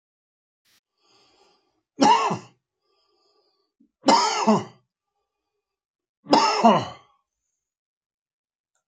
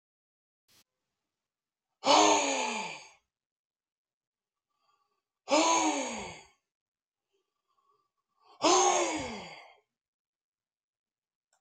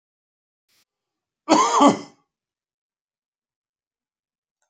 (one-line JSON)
{"three_cough_length": "8.9 s", "three_cough_amplitude": 27299, "three_cough_signal_mean_std_ratio": 0.31, "exhalation_length": "11.6 s", "exhalation_amplitude": 10121, "exhalation_signal_mean_std_ratio": 0.34, "cough_length": "4.7 s", "cough_amplitude": 27400, "cough_signal_mean_std_ratio": 0.24, "survey_phase": "beta (2021-08-13 to 2022-03-07)", "age": "65+", "gender": "Male", "wearing_mask": "No", "symptom_none": true, "symptom_onset": "12 days", "smoker_status": "Ex-smoker", "respiratory_condition_asthma": true, "respiratory_condition_other": false, "recruitment_source": "REACT", "submission_delay": "2 days", "covid_test_result": "Negative", "covid_test_method": "RT-qPCR"}